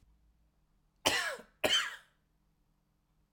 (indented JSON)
{
  "cough_length": "3.3 s",
  "cough_amplitude": 11015,
  "cough_signal_mean_std_ratio": 0.33,
  "survey_phase": "alpha (2021-03-01 to 2021-08-12)",
  "age": "45-64",
  "gender": "Male",
  "wearing_mask": "No",
  "symptom_none": true,
  "symptom_onset": "12 days",
  "smoker_status": "Never smoked",
  "respiratory_condition_asthma": false,
  "respiratory_condition_other": false,
  "recruitment_source": "REACT",
  "submission_delay": "1 day",
  "covid_test_result": "Negative",
  "covid_test_method": "RT-qPCR"
}